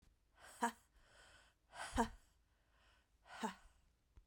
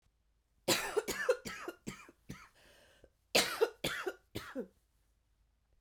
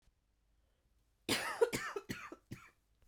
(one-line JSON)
{"exhalation_length": "4.3 s", "exhalation_amplitude": 2417, "exhalation_signal_mean_std_ratio": 0.3, "three_cough_length": "5.8 s", "three_cough_amplitude": 6571, "three_cough_signal_mean_std_ratio": 0.38, "cough_length": "3.1 s", "cough_amplitude": 4323, "cough_signal_mean_std_ratio": 0.36, "survey_phase": "beta (2021-08-13 to 2022-03-07)", "age": "45-64", "gender": "Female", "wearing_mask": "No", "symptom_cough_any": true, "symptom_runny_or_blocked_nose": true, "symptom_shortness_of_breath": true, "symptom_fatigue": true, "symptom_fever_high_temperature": true, "symptom_headache": true, "symptom_onset": "5 days", "smoker_status": "Current smoker (1 to 10 cigarettes per day)", "respiratory_condition_asthma": false, "respiratory_condition_other": false, "recruitment_source": "Test and Trace", "submission_delay": "1 day", "covid_test_result": "Positive", "covid_test_method": "RT-qPCR", "covid_ct_value": 21.7, "covid_ct_gene": "ORF1ab gene", "covid_ct_mean": 22.1, "covid_viral_load": "56000 copies/ml", "covid_viral_load_category": "Low viral load (10K-1M copies/ml)"}